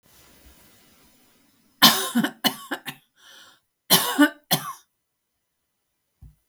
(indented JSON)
{
  "cough_length": "6.5 s",
  "cough_amplitude": 32768,
  "cough_signal_mean_std_ratio": 0.29,
  "survey_phase": "beta (2021-08-13 to 2022-03-07)",
  "age": "65+",
  "gender": "Female",
  "wearing_mask": "No",
  "symptom_none": true,
  "smoker_status": "Never smoked",
  "respiratory_condition_asthma": false,
  "respiratory_condition_other": false,
  "recruitment_source": "REACT",
  "submission_delay": "1 day",
  "covid_test_result": "Negative",
  "covid_test_method": "RT-qPCR"
}